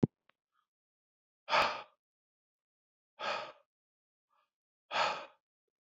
{"exhalation_length": "5.8 s", "exhalation_amplitude": 7772, "exhalation_signal_mean_std_ratio": 0.27, "survey_phase": "beta (2021-08-13 to 2022-03-07)", "age": "45-64", "gender": "Male", "wearing_mask": "No", "symptom_none": true, "symptom_onset": "11 days", "smoker_status": "Ex-smoker", "respiratory_condition_asthma": false, "respiratory_condition_other": false, "recruitment_source": "REACT", "submission_delay": "3 days", "covid_test_result": "Negative", "covid_test_method": "RT-qPCR", "influenza_a_test_result": "Negative", "influenza_b_test_result": "Negative"}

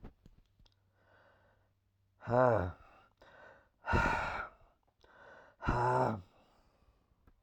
{"exhalation_length": "7.4 s", "exhalation_amplitude": 6214, "exhalation_signal_mean_std_ratio": 0.38, "survey_phase": "alpha (2021-03-01 to 2021-08-12)", "age": "65+", "gender": "Male", "wearing_mask": "No", "symptom_none": true, "symptom_onset": "5 days", "smoker_status": "Never smoked", "respiratory_condition_asthma": false, "respiratory_condition_other": false, "recruitment_source": "REACT", "submission_delay": "1 day", "covid_test_result": "Negative", "covid_test_method": "RT-qPCR"}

